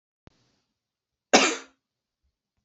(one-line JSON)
{"cough_length": "2.6 s", "cough_amplitude": 25784, "cough_signal_mean_std_ratio": 0.21, "survey_phase": "beta (2021-08-13 to 2022-03-07)", "age": "45-64", "gender": "Male", "wearing_mask": "No", "symptom_cough_any": true, "symptom_sore_throat": true, "symptom_fatigue": true, "symptom_fever_high_temperature": true, "symptom_headache": true, "symptom_onset": "3 days", "smoker_status": "Never smoked", "respiratory_condition_asthma": false, "respiratory_condition_other": false, "recruitment_source": "Test and Trace", "submission_delay": "2 days", "covid_test_result": "Positive", "covid_test_method": "RT-qPCR", "covid_ct_value": 16.8, "covid_ct_gene": "ORF1ab gene", "covid_ct_mean": 18.0, "covid_viral_load": "1300000 copies/ml", "covid_viral_load_category": "High viral load (>1M copies/ml)"}